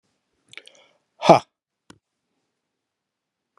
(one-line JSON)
{"exhalation_length": "3.6 s", "exhalation_amplitude": 32409, "exhalation_signal_mean_std_ratio": 0.15, "survey_phase": "beta (2021-08-13 to 2022-03-07)", "age": "65+", "gender": "Male", "wearing_mask": "No", "symptom_none": true, "smoker_status": "Ex-smoker", "respiratory_condition_asthma": false, "respiratory_condition_other": false, "recruitment_source": "REACT", "submission_delay": "4 days", "covid_test_result": "Negative", "covid_test_method": "RT-qPCR"}